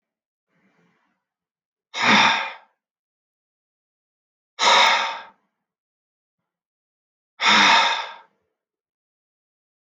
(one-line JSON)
{"exhalation_length": "9.9 s", "exhalation_amplitude": 22432, "exhalation_signal_mean_std_ratio": 0.33, "survey_phase": "beta (2021-08-13 to 2022-03-07)", "age": "45-64", "gender": "Male", "wearing_mask": "No", "symptom_none": true, "smoker_status": "Never smoked", "respiratory_condition_asthma": false, "respiratory_condition_other": false, "recruitment_source": "REACT", "submission_delay": "0 days", "covid_test_result": "Negative", "covid_test_method": "RT-qPCR"}